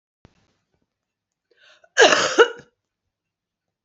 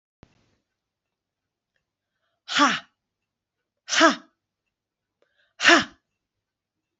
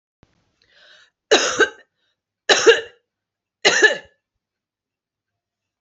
{"cough_length": "3.8 s", "cough_amplitude": 31592, "cough_signal_mean_std_ratio": 0.25, "exhalation_length": "7.0 s", "exhalation_amplitude": 25238, "exhalation_signal_mean_std_ratio": 0.24, "three_cough_length": "5.8 s", "three_cough_amplitude": 32768, "three_cough_signal_mean_std_ratio": 0.3, "survey_phase": "beta (2021-08-13 to 2022-03-07)", "age": "45-64", "gender": "Female", "wearing_mask": "No", "symptom_runny_or_blocked_nose": true, "symptom_change_to_sense_of_smell_or_taste": true, "symptom_loss_of_taste": true, "symptom_onset": "5 days", "smoker_status": "Never smoked", "respiratory_condition_asthma": false, "respiratory_condition_other": false, "recruitment_source": "Test and Trace", "submission_delay": "1 day", "covid_test_result": "Positive", "covid_test_method": "RT-qPCR", "covid_ct_value": 22.9, "covid_ct_gene": "N gene", "covid_ct_mean": 24.1, "covid_viral_load": "12000 copies/ml", "covid_viral_load_category": "Low viral load (10K-1M copies/ml)"}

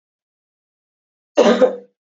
{"cough_length": "2.1 s", "cough_amplitude": 28547, "cough_signal_mean_std_ratio": 0.31, "survey_phase": "beta (2021-08-13 to 2022-03-07)", "age": "45-64", "gender": "Female", "wearing_mask": "No", "symptom_cough_any": true, "smoker_status": "Never smoked", "respiratory_condition_asthma": false, "respiratory_condition_other": false, "recruitment_source": "Test and Trace", "submission_delay": "2 days", "covid_test_result": "Positive", "covid_test_method": "RT-qPCR", "covid_ct_value": 20.0, "covid_ct_gene": "ORF1ab gene", "covid_ct_mean": 20.2, "covid_viral_load": "230000 copies/ml", "covid_viral_load_category": "Low viral load (10K-1M copies/ml)"}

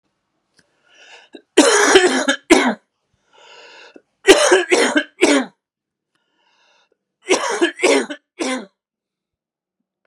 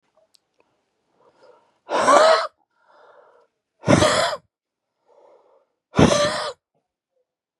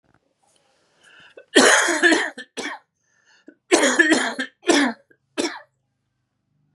{"three_cough_length": "10.1 s", "three_cough_amplitude": 32768, "three_cough_signal_mean_std_ratio": 0.41, "exhalation_length": "7.6 s", "exhalation_amplitude": 31892, "exhalation_signal_mean_std_ratio": 0.35, "cough_length": "6.7 s", "cough_amplitude": 32704, "cough_signal_mean_std_ratio": 0.41, "survey_phase": "beta (2021-08-13 to 2022-03-07)", "age": "45-64", "gender": "Male", "wearing_mask": "No", "symptom_cough_any": true, "symptom_runny_or_blocked_nose": true, "symptom_fatigue": true, "symptom_headache": true, "symptom_change_to_sense_of_smell_or_taste": true, "symptom_loss_of_taste": true, "symptom_onset": "8 days", "smoker_status": "Never smoked", "respiratory_condition_asthma": false, "respiratory_condition_other": false, "recruitment_source": "Test and Trace", "submission_delay": "2 days", "covid_test_result": "Positive", "covid_test_method": "RT-qPCR", "covid_ct_value": 18.8, "covid_ct_gene": "ORF1ab gene", "covid_ct_mean": 19.0, "covid_viral_load": "590000 copies/ml", "covid_viral_load_category": "Low viral load (10K-1M copies/ml)"}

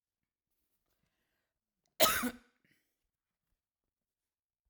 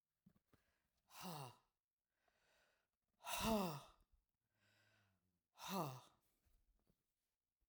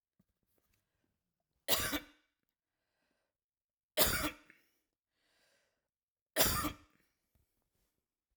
{"cough_length": "4.7 s", "cough_amplitude": 9639, "cough_signal_mean_std_ratio": 0.18, "exhalation_length": "7.7 s", "exhalation_amplitude": 1103, "exhalation_signal_mean_std_ratio": 0.31, "three_cough_length": "8.4 s", "three_cough_amplitude": 7718, "three_cough_signal_mean_std_ratio": 0.26, "survey_phase": "alpha (2021-03-01 to 2021-08-12)", "age": "45-64", "gender": "Female", "wearing_mask": "No", "symptom_none": true, "smoker_status": "Never smoked", "respiratory_condition_asthma": false, "respiratory_condition_other": false, "recruitment_source": "REACT", "submission_delay": "1 day", "covid_test_result": "Negative", "covid_test_method": "RT-qPCR"}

